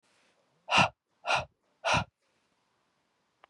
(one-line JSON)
{"exhalation_length": "3.5 s", "exhalation_amplitude": 10699, "exhalation_signal_mean_std_ratio": 0.3, "survey_phase": "beta (2021-08-13 to 2022-03-07)", "age": "18-44", "gender": "Female", "wearing_mask": "No", "symptom_new_continuous_cough": true, "symptom_sore_throat": true, "symptom_diarrhoea": true, "symptom_fatigue": true, "symptom_fever_high_temperature": true, "symptom_other": true, "smoker_status": "Never smoked", "respiratory_condition_asthma": false, "respiratory_condition_other": false, "recruitment_source": "Test and Trace", "submission_delay": "2 days", "covid_test_result": "Positive", "covid_test_method": "LFT"}